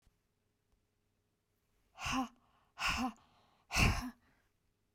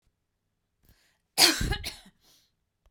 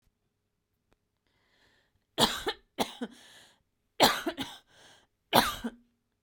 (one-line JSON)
{"exhalation_length": "4.9 s", "exhalation_amplitude": 4565, "exhalation_signal_mean_std_ratio": 0.34, "cough_length": "2.9 s", "cough_amplitude": 22017, "cough_signal_mean_std_ratio": 0.27, "three_cough_length": "6.2 s", "three_cough_amplitude": 20350, "three_cough_signal_mean_std_ratio": 0.29, "survey_phase": "beta (2021-08-13 to 2022-03-07)", "age": "45-64", "gender": "Female", "wearing_mask": "No", "symptom_none": true, "smoker_status": "Never smoked", "respiratory_condition_asthma": true, "respiratory_condition_other": false, "recruitment_source": "REACT", "submission_delay": "1 day", "covid_test_result": "Negative", "covid_test_method": "RT-qPCR", "influenza_a_test_result": "Unknown/Void", "influenza_b_test_result": "Unknown/Void"}